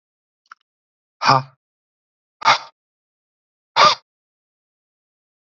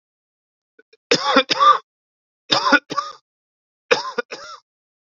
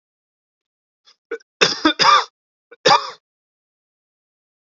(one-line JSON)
{"exhalation_length": "5.5 s", "exhalation_amplitude": 31429, "exhalation_signal_mean_std_ratio": 0.23, "three_cough_length": "5.0 s", "three_cough_amplitude": 32767, "three_cough_signal_mean_std_ratio": 0.35, "cough_length": "4.6 s", "cough_amplitude": 32767, "cough_signal_mean_std_ratio": 0.29, "survey_phase": "beta (2021-08-13 to 2022-03-07)", "age": "18-44", "gender": "Male", "wearing_mask": "No", "symptom_cough_any": true, "symptom_runny_or_blocked_nose": true, "symptom_sore_throat": true, "symptom_headache": true, "symptom_onset": "2 days", "smoker_status": "Never smoked", "respiratory_condition_asthma": false, "respiratory_condition_other": false, "recruitment_source": "Test and Trace", "submission_delay": "1 day", "covid_test_result": "Positive", "covid_test_method": "ePCR"}